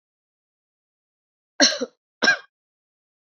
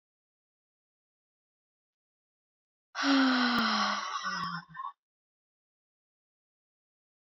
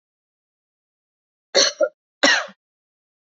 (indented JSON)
{
  "three_cough_length": "3.3 s",
  "three_cough_amplitude": 30581,
  "three_cough_signal_mean_std_ratio": 0.24,
  "exhalation_length": "7.3 s",
  "exhalation_amplitude": 5701,
  "exhalation_signal_mean_std_ratio": 0.38,
  "cough_length": "3.3 s",
  "cough_amplitude": 28479,
  "cough_signal_mean_std_ratio": 0.28,
  "survey_phase": "beta (2021-08-13 to 2022-03-07)",
  "age": "45-64",
  "gender": "Female",
  "wearing_mask": "No",
  "symptom_runny_or_blocked_nose": true,
  "symptom_onset": "3 days",
  "smoker_status": "Never smoked",
  "respiratory_condition_asthma": false,
  "respiratory_condition_other": false,
  "recruitment_source": "Test and Trace",
  "submission_delay": "1 day",
  "covid_test_result": "Positive",
  "covid_test_method": "RT-qPCR",
  "covid_ct_value": 19.0,
  "covid_ct_gene": "N gene"
}